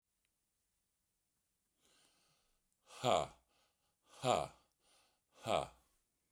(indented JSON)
{
  "exhalation_length": "6.3 s",
  "exhalation_amplitude": 4399,
  "exhalation_signal_mean_std_ratio": 0.25,
  "survey_phase": "beta (2021-08-13 to 2022-03-07)",
  "age": "45-64",
  "gender": "Male",
  "wearing_mask": "No",
  "symptom_shortness_of_breath": true,
  "symptom_fatigue": true,
  "smoker_status": "Never smoked",
  "respiratory_condition_asthma": false,
  "respiratory_condition_other": false,
  "recruitment_source": "REACT",
  "submission_delay": "1 day",
  "covid_test_result": "Negative",
  "covid_test_method": "RT-qPCR"
}